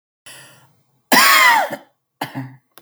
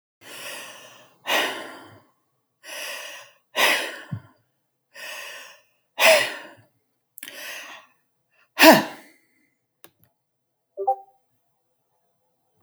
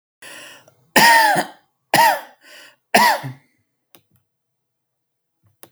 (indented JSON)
{
  "cough_length": "2.8 s",
  "cough_amplitude": 32768,
  "cough_signal_mean_std_ratio": 0.42,
  "exhalation_length": "12.6 s",
  "exhalation_amplitude": 32768,
  "exhalation_signal_mean_std_ratio": 0.28,
  "three_cough_length": "5.7 s",
  "three_cough_amplitude": 32712,
  "three_cough_signal_mean_std_ratio": 0.36,
  "survey_phase": "beta (2021-08-13 to 2022-03-07)",
  "age": "18-44",
  "gender": "Male",
  "wearing_mask": "No",
  "symptom_none": true,
  "smoker_status": "Never smoked",
  "respiratory_condition_asthma": false,
  "respiratory_condition_other": false,
  "recruitment_source": "REACT",
  "submission_delay": "13 days",
  "covid_test_result": "Negative",
  "covid_test_method": "RT-qPCR"
}